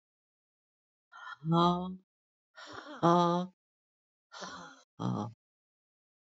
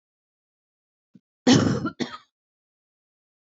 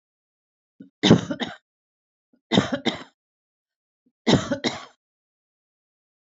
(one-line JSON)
{"exhalation_length": "6.4 s", "exhalation_amplitude": 9421, "exhalation_signal_mean_std_ratio": 0.33, "cough_length": "3.5 s", "cough_amplitude": 19949, "cough_signal_mean_std_ratio": 0.27, "three_cough_length": "6.2 s", "three_cough_amplitude": 26242, "three_cough_signal_mean_std_ratio": 0.27, "survey_phase": "beta (2021-08-13 to 2022-03-07)", "age": "45-64", "gender": "Female", "wearing_mask": "No", "symptom_none": true, "smoker_status": "Current smoker (11 or more cigarettes per day)", "respiratory_condition_asthma": true, "respiratory_condition_other": false, "recruitment_source": "REACT", "submission_delay": "2 days", "covid_test_result": "Negative", "covid_test_method": "RT-qPCR", "influenza_a_test_result": "Negative", "influenza_b_test_result": "Negative"}